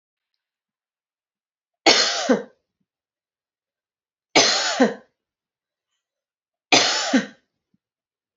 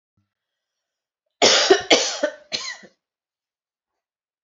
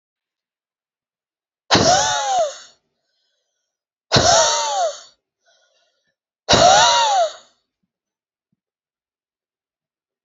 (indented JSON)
{
  "three_cough_length": "8.4 s",
  "three_cough_amplitude": 31631,
  "three_cough_signal_mean_std_ratio": 0.32,
  "cough_length": "4.4 s",
  "cough_amplitude": 32624,
  "cough_signal_mean_std_ratio": 0.32,
  "exhalation_length": "10.2 s",
  "exhalation_amplitude": 31305,
  "exhalation_signal_mean_std_ratio": 0.4,
  "survey_phase": "beta (2021-08-13 to 2022-03-07)",
  "age": "18-44",
  "gender": "Female",
  "wearing_mask": "No",
  "symptom_cough_any": true,
  "symptom_runny_or_blocked_nose": true,
  "symptom_sore_throat": true,
  "smoker_status": "Never smoked",
  "respiratory_condition_asthma": false,
  "respiratory_condition_other": false,
  "recruitment_source": "REACT",
  "submission_delay": "7 days",
  "covid_test_result": "Negative",
  "covid_test_method": "RT-qPCR",
  "influenza_a_test_result": "Negative",
  "influenza_b_test_result": "Negative"
}